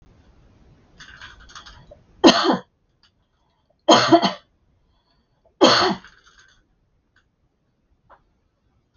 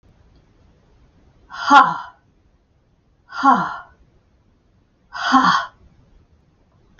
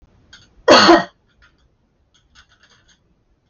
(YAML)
three_cough_length: 9.0 s
three_cough_amplitude: 32602
three_cough_signal_mean_std_ratio: 0.27
exhalation_length: 7.0 s
exhalation_amplitude: 28482
exhalation_signal_mean_std_ratio: 0.31
cough_length: 3.5 s
cough_amplitude: 32330
cough_signal_mean_std_ratio: 0.27
survey_phase: alpha (2021-03-01 to 2021-08-12)
age: 45-64
gender: Female
wearing_mask: 'No'
symptom_none: true
smoker_status: Prefer not to say
respiratory_condition_asthma: false
respiratory_condition_other: false
recruitment_source: REACT
submission_delay: 1 day
covid_test_result: Negative
covid_test_method: RT-qPCR